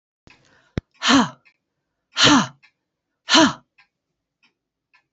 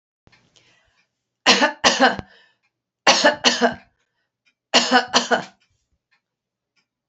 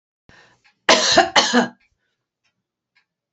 {"exhalation_length": "5.1 s", "exhalation_amplitude": 29235, "exhalation_signal_mean_std_ratio": 0.31, "three_cough_length": "7.1 s", "three_cough_amplitude": 30125, "three_cough_signal_mean_std_ratio": 0.36, "cough_length": "3.3 s", "cough_amplitude": 32439, "cough_signal_mean_std_ratio": 0.35, "survey_phase": "beta (2021-08-13 to 2022-03-07)", "age": "45-64", "gender": "Female", "wearing_mask": "No", "symptom_cough_any": true, "smoker_status": "Never smoked", "respiratory_condition_asthma": false, "respiratory_condition_other": false, "recruitment_source": "Test and Trace", "submission_delay": "2 days", "covid_test_result": "Negative", "covid_test_method": "RT-qPCR"}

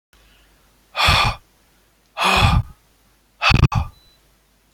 {"exhalation_length": "4.7 s", "exhalation_amplitude": 26879, "exhalation_signal_mean_std_ratio": 0.41, "survey_phase": "beta (2021-08-13 to 2022-03-07)", "age": "65+", "gender": "Male", "wearing_mask": "No", "symptom_none": true, "smoker_status": "Ex-smoker", "respiratory_condition_asthma": false, "respiratory_condition_other": false, "recruitment_source": "REACT", "submission_delay": "1 day", "covid_test_result": "Negative", "covid_test_method": "RT-qPCR", "influenza_a_test_result": "Negative", "influenza_b_test_result": "Negative"}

